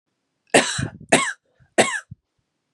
{"three_cough_length": "2.7 s", "three_cough_amplitude": 32223, "three_cough_signal_mean_std_ratio": 0.35, "survey_phase": "beta (2021-08-13 to 2022-03-07)", "age": "18-44", "gender": "Male", "wearing_mask": "No", "symptom_cough_any": true, "symptom_headache": true, "symptom_onset": "3 days", "smoker_status": "Never smoked", "respiratory_condition_asthma": false, "respiratory_condition_other": false, "recruitment_source": "Test and Trace", "submission_delay": "1 day", "covid_test_result": "Negative", "covid_test_method": "ePCR"}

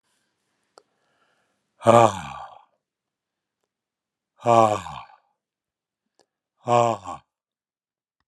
{"exhalation_length": "8.3 s", "exhalation_amplitude": 31509, "exhalation_signal_mean_std_ratio": 0.24, "survey_phase": "alpha (2021-03-01 to 2021-08-12)", "age": "65+", "gender": "Male", "wearing_mask": "No", "symptom_none": true, "smoker_status": "Ex-smoker", "respiratory_condition_asthma": false, "respiratory_condition_other": false, "recruitment_source": "REACT", "submission_delay": "2 days", "covid_test_result": "Negative", "covid_test_method": "RT-qPCR"}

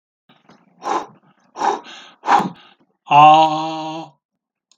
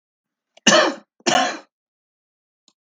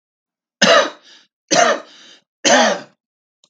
{"exhalation_length": "4.8 s", "exhalation_amplitude": 32768, "exhalation_signal_mean_std_ratio": 0.4, "cough_length": "2.8 s", "cough_amplitude": 32768, "cough_signal_mean_std_ratio": 0.34, "three_cough_length": "3.5 s", "three_cough_amplitude": 32768, "three_cough_signal_mean_std_ratio": 0.41, "survey_phase": "beta (2021-08-13 to 2022-03-07)", "age": "65+", "gender": "Male", "wearing_mask": "No", "symptom_none": true, "smoker_status": "Ex-smoker", "respiratory_condition_asthma": false, "respiratory_condition_other": false, "recruitment_source": "REACT", "submission_delay": "8 days", "covid_test_result": "Negative", "covid_test_method": "RT-qPCR", "influenza_a_test_result": "Unknown/Void", "influenza_b_test_result": "Unknown/Void"}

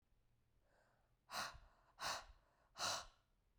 {"exhalation_length": "3.6 s", "exhalation_amplitude": 1035, "exhalation_signal_mean_std_ratio": 0.4, "survey_phase": "beta (2021-08-13 to 2022-03-07)", "age": "18-44", "gender": "Female", "wearing_mask": "No", "symptom_cough_any": true, "symptom_runny_or_blocked_nose": true, "symptom_sore_throat": true, "symptom_onset": "3 days", "smoker_status": "Never smoked", "respiratory_condition_asthma": false, "respiratory_condition_other": false, "recruitment_source": "Test and Trace", "submission_delay": "1 day", "covid_test_result": "Positive", "covid_test_method": "RT-qPCR", "covid_ct_value": 17.8, "covid_ct_gene": "ORF1ab gene"}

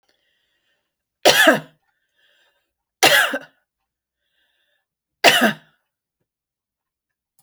{"three_cough_length": "7.4 s", "three_cough_amplitude": 32767, "three_cough_signal_mean_std_ratio": 0.27, "survey_phase": "beta (2021-08-13 to 2022-03-07)", "age": "65+", "gender": "Female", "wearing_mask": "No", "symptom_none": true, "smoker_status": "Never smoked", "respiratory_condition_asthma": false, "respiratory_condition_other": false, "recruitment_source": "REACT", "submission_delay": "4 days", "covid_test_result": "Negative", "covid_test_method": "RT-qPCR"}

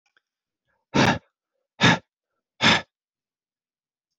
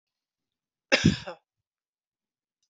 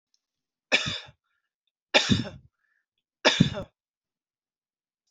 {"exhalation_length": "4.2 s", "exhalation_amplitude": 22190, "exhalation_signal_mean_std_ratio": 0.28, "cough_length": "2.7 s", "cough_amplitude": 16773, "cough_signal_mean_std_ratio": 0.21, "three_cough_length": "5.1 s", "three_cough_amplitude": 20296, "three_cough_signal_mean_std_ratio": 0.28, "survey_phase": "beta (2021-08-13 to 2022-03-07)", "age": "18-44", "gender": "Male", "wearing_mask": "No", "symptom_none": true, "smoker_status": "Never smoked", "respiratory_condition_asthma": false, "respiratory_condition_other": false, "recruitment_source": "REACT", "submission_delay": "1 day", "covid_test_result": "Negative", "covid_test_method": "RT-qPCR"}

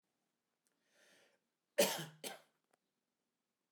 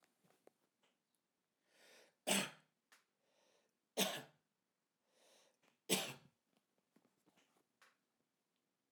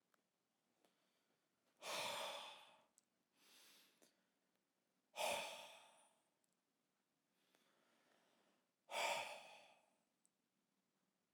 {"cough_length": "3.7 s", "cough_amplitude": 3412, "cough_signal_mean_std_ratio": 0.21, "three_cough_length": "8.9 s", "three_cough_amplitude": 3350, "three_cough_signal_mean_std_ratio": 0.22, "exhalation_length": "11.3 s", "exhalation_amplitude": 944, "exhalation_signal_mean_std_ratio": 0.33, "survey_phase": "alpha (2021-03-01 to 2021-08-12)", "age": "45-64", "gender": "Male", "wearing_mask": "No", "symptom_none": true, "smoker_status": "Never smoked", "respiratory_condition_asthma": false, "respiratory_condition_other": false, "recruitment_source": "REACT", "submission_delay": "4 days", "covid_test_result": "Negative", "covid_test_method": "RT-qPCR"}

